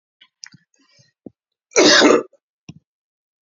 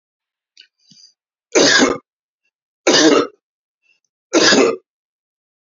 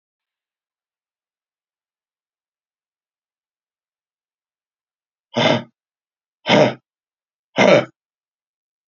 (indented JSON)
{
  "cough_length": "3.4 s",
  "cough_amplitude": 32129,
  "cough_signal_mean_std_ratio": 0.3,
  "three_cough_length": "5.6 s",
  "three_cough_amplitude": 32768,
  "three_cough_signal_mean_std_ratio": 0.39,
  "exhalation_length": "8.9 s",
  "exhalation_amplitude": 30620,
  "exhalation_signal_mean_std_ratio": 0.22,
  "survey_phase": "beta (2021-08-13 to 2022-03-07)",
  "age": "45-64",
  "gender": "Male",
  "wearing_mask": "No",
  "symptom_none": true,
  "smoker_status": "Never smoked",
  "respiratory_condition_asthma": false,
  "respiratory_condition_other": false,
  "recruitment_source": "Test and Trace",
  "submission_delay": "0 days",
  "covid_test_result": "Negative",
  "covid_test_method": "LFT"
}